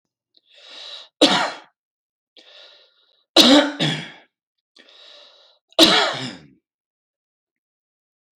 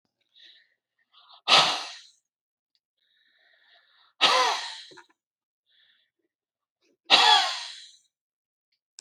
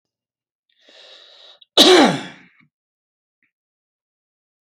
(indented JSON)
{
  "three_cough_length": "8.4 s",
  "three_cough_amplitude": 32768,
  "three_cough_signal_mean_std_ratio": 0.3,
  "exhalation_length": "9.0 s",
  "exhalation_amplitude": 26834,
  "exhalation_signal_mean_std_ratio": 0.29,
  "cough_length": "4.6 s",
  "cough_amplitude": 31000,
  "cough_signal_mean_std_ratio": 0.25,
  "survey_phase": "beta (2021-08-13 to 2022-03-07)",
  "age": "45-64",
  "gender": "Male",
  "wearing_mask": "No",
  "symptom_none": true,
  "smoker_status": "Never smoked",
  "respiratory_condition_asthma": false,
  "respiratory_condition_other": false,
  "recruitment_source": "REACT",
  "submission_delay": "4 days",
  "covid_test_result": "Negative",
  "covid_test_method": "RT-qPCR"
}